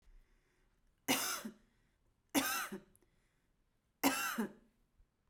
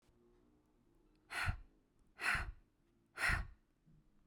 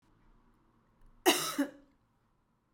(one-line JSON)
{"three_cough_length": "5.3 s", "three_cough_amplitude": 4938, "three_cough_signal_mean_std_ratio": 0.38, "exhalation_length": "4.3 s", "exhalation_amplitude": 2254, "exhalation_signal_mean_std_ratio": 0.38, "cough_length": "2.7 s", "cough_amplitude": 8992, "cough_signal_mean_std_ratio": 0.28, "survey_phase": "beta (2021-08-13 to 2022-03-07)", "age": "18-44", "gender": "Female", "wearing_mask": "No", "symptom_none": true, "smoker_status": "Never smoked", "respiratory_condition_asthma": false, "respiratory_condition_other": false, "recruitment_source": "REACT", "submission_delay": "0 days", "covid_test_result": "Negative", "covid_test_method": "RT-qPCR"}